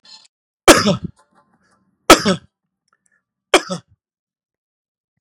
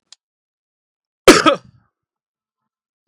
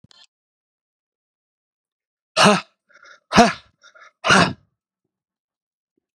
{
  "three_cough_length": "5.2 s",
  "three_cough_amplitude": 32768,
  "three_cough_signal_mean_std_ratio": 0.24,
  "cough_length": "3.1 s",
  "cough_amplitude": 32768,
  "cough_signal_mean_std_ratio": 0.21,
  "exhalation_length": "6.1 s",
  "exhalation_amplitude": 32767,
  "exhalation_signal_mean_std_ratio": 0.25,
  "survey_phase": "beta (2021-08-13 to 2022-03-07)",
  "age": "45-64",
  "gender": "Male",
  "wearing_mask": "No",
  "symptom_none": true,
  "smoker_status": "Never smoked",
  "respiratory_condition_asthma": false,
  "respiratory_condition_other": false,
  "recruitment_source": "REACT",
  "submission_delay": "2 days",
  "covid_test_result": "Negative",
  "covid_test_method": "RT-qPCR",
  "influenza_a_test_result": "Negative",
  "influenza_b_test_result": "Negative"
}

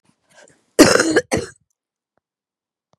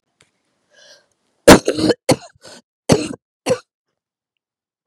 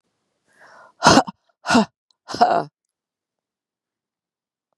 {
  "cough_length": "3.0 s",
  "cough_amplitude": 32768,
  "cough_signal_mean_std_ratio": 0.3,
  "three_cough_length": "4.9 s",
  "three_cough_amplitude": 32768,
  "three_cough_signal_mean_std_ratio": 0.25,
  "exhalation_length": "4.8 s",
  "exhalation_amplitude": 32768,
  "exhalation_signal_mean_std_ratio": 0.28,
  "survey_phase": "beta (2021-08-13 to 2022-03-07)",
  "age": "18-44",
  "gender": "Female",
  "wearing_mask": "No",
  "symptom_cough_any": true,
  "symptom_shortness_of_breath": true,
  "symptom_sore_throat": true,
  "symptom_diarrhoea": true,
  "symptom_fatigue": true,
  "symptom_fever_high_temperature": true,
  "symptom_headache": true,
  "symptom_onset": "3 days",
  "smoker_status": "Never smoked",
  "respiratory_condition_asthma": false,
  "respiratory_condition_other": false,
  "recruitment_source": "Test and Trace",
  "submission_delay": "2 days",
  "covid_test_result": "Positive",
  "covid_test_method": "ePCR"
}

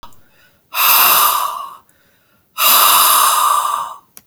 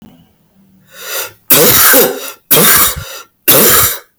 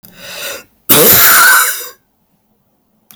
{
  "exhalation_length": "4.3 s",
  "exhalation_amplitude": 32768,
  "exhalation_signal_mean_std_ratio": 0.65,
  "three_cough_length": "4.2 s",
  "three_cough_amplitude": 32768,
  "three_cough_signal_mean_std_ratio": 0.67,
  "cough_length": "3.2 s",
  "cough_amplitude": 32768,
  "cough_signal_mean_std_ratio": 0.56,
  "survey_phase": "beta (2021-08-13 to 2022-03-07)",
  "age": "65+",
  "gender": "Male",
  "wearing_mask": "No",
  "symptom_none": true,
  "smoker_status": "Never smoked",
  "respiratory_condition_asthma": false,
  "respiratory_condition_other": false,
  "recruitment_source": "REACT",
  "submission_delay": "4 days",
  "covid_test_result": "Negative",
  "covid_test_method": "RT-qPCR"
}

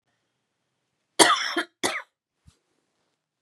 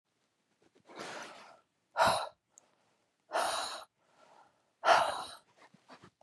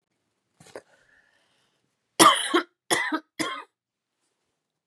{
  "cough_length": "3.4 s",
  "cough_amplitude": 32768,
  "cough_signal_mean_std_ratio": 0.27,
  "exhalation_length": "6.2 s",
  "exhalation_amplitude": 9037,
  "exhalation_signal_mean_std_ratio": 0.34,
  "three_cough_length": "4.9 s",
  "three_cough_amplitude": 31495,
  "three_cough_signal_mean_std_ratio": 0.27,
  "survey_phase": "beta (2021-08-13 to 2022-03-07)",
  "age": "18-44",
  "gender": "Female",
  "wearing_mask": "No",
  "symptom_cough_any": true,
  "symptom_sore_throat": true,
  "symptom_fatigue": true,
  "symptom_headache": true,
  "symptom_onset": "2 days",
  "smoker_status": "Never smoked",
  "respiratory_condition_asthma": false,
  "respiratory_condition_other": false,
  "recruitment_source": "Test and Trace",
  "submission_delay": "1 day",
  "covid_test_result": "Negative",
  "covid_test_method": "RT-qPCR"
}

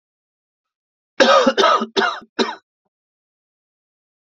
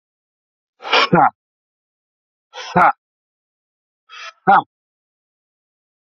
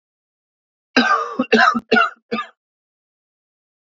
{
  "three_cough_length": "4.4 s",
  "three_cough_amplitude": 29804,
  "three_cough_signal_mean_std_ratio": 0.36,
  "exhalation_length": "6.1 s",
  "exhalation_amplitude": 32248,
  "exhalation_signal_mean_std_ratio": 0.27,
  "cough_length": "3.9 s",
  "cough_amplitude": 30225,
  "cough_signal_mean_std_ratio": 0.39,
  "survey_phase": "beta (2021-08-13 to 2022-03-07)",
  "age": "45-64",
  "gender": "Male",
  "wearing_mask": "Yes",
  "symptom_cough_any": true,
  "symptom_runny_or_blocked_nose": true,
  "symptom_fatigue": true,
  "symptom_onset": "3 days",
  "smoker_status": "Never smoked",
  "respiratory_condition_asthma": false,
  "respiratory_condition_other": false,
  "recruitment_source": "Test and Trace",
  "submission_delay": "1 day",
  "covid_test_result": "Positive",
  "covid_test_method": "RT-qPCR",
  "covid_ct_value": 21.4,
  "covid_ct_gene": "ORF1ab gene"
}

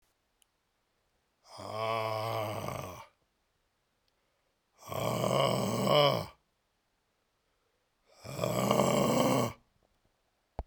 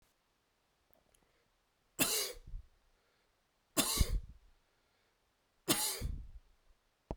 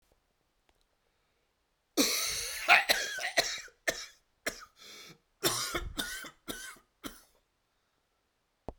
{
  "exhalation_length": "10.7 s",
  "exhalation_amplitude": 9956,
  "exhalation_signal_mean_std_ratio": 0.47,
  "three_cough_length": "7.2 s",
  "three_cough_amplitude": 6098,
  "three_cough_signal_mean_std_ratio": 0.35,
  "cough_length": "8.8 s",
  "cough_amplitude": 15845,
  "cough_signal_mean_std_ratio": 0.37,
  "survey_phase": "beta (2021-08-13 to 2022-03-07)",
  "age": "45-64",
  "gender": "Male",
  "wearing_mask": "No",
  "symptom_new_continuous_cough": true,
  "symptom_runny_or_blocked_nose": true,
  "symptom_headache": true,
  "symptom_onset": "5 days",
  "smoker_status": "Ex-smoker",
  "respiratory_condition_asthma": false,
  "respiratory_condition_other": false,
  "recruitment_source": "Test and Trace",
  "submission_delay": "1 day",
  "covid_test_result": "Positive",
  "covid_test_method": "RT-qPCR",
  "covid_ct_value": 14.4,
  "covid_ct_gene": "ORF1ab gene",
  "covid_ct_mean": 14.7,
  "covid_viral_load": "15000000 copies/ml",
  "covid_viral_load_category": "High viral load (>1M copies/ml)"
}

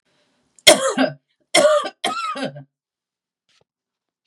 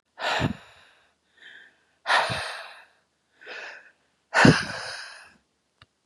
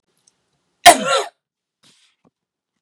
{
  "three_cough_length": "4.3 s",
  "three_cough_amplitude": 32768,
  "three_cough_signal_mean_std_ratio": 0.36,
  "exhalation_length": "6.1 s",
  "exhalation_amplitude": 31952,
  "exhalation_signal_mean_std_ratio": 0.33,
  "cough_length": "2.8 s",
  "cough_amplitude": 32768,
  "cough_signal_mean_std_ratio": 0.22,
  "survey_phase": "beta (2021-08-13 to 2022-03-07)",
  "age": "65+",
  "gender": "Female",
  "wearing_mask": "No",
  "symptom_none": true,
  "smoker_status": "Never smoked",
  "respiratory_condition_asthma": false,
  "respiratory_condition_other": false,
  "recruitment_source": "REACT",
  "submission_delay": "2 days",
  "covid_test_result": "Negative",
  "covid_test_method": "RT-qPCR",
  "influenza_a_test_result": "Negative",
  "influenza_b_test_result": "Negative"
}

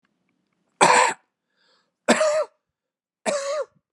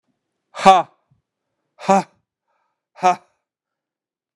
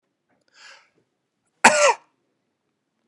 {
  "three_cough_length": "3.9 s",
  "three_cough_amplitude": 25667,
  "three_cough_signal_mean_std_ratio": 0.4,
  "exhalation_length": "4.4 s",
  "exhalation_amplitude": 32768,
  "exhalation_signal_mean_std_ratio": 0.24,
  "cough_length": "3.1 s",
  "cough_amplitude": 32768,
  "cough_signal_mean_std_ratio": 0.23,
  "survey_phase": "beta (2021-08-13 to 2022-03-07)",
  "age": "18-44",
  "gender": "Male",
  "wearing_mask": "No",
  "symptom_none": true,
  "symptom_onset": "12 days",
  "smoker_status": "Never smoked",
  "respiratory_condition_asthma": false,
  "respiratory_condition_other": false,
  "recruitment_source": "REACT",
  "submission_delay": "1 day",
  "covid_test_result": "Negative",
  "covid_test_method": "RT-qPCR",
  "influenza_a_test_result": "Negative",
  "influenza_b_test_result": "Negative"
}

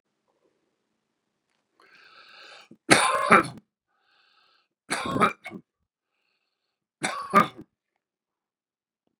{
  "three_cough_length": "9.2 s",
  "three_cough_amplitude": 31515,
  "three_cough_signal_mean_std_ratio": 0.25,
  "survey_phase": "beta (2021-08-13 to 2022-03-07)",
  "age": "65+",
  "gender": "Male",
  "wearing_mask": "No",
  "symptom_cough_any": true,
  "smoker_status": "Ex-smoker",
  "respiratory_condition_asthma": false,
  "respiratory_condition_other": false,
  "recruitment_source": "REACT",
  "submission_delay": "3 days",
  "covid_test_result": "Negative",
  "covid_test_method": "RT-qPCR",
  "influenza_a_test_result": "Negative",
  "influenza_b_test_result": "Negative"
}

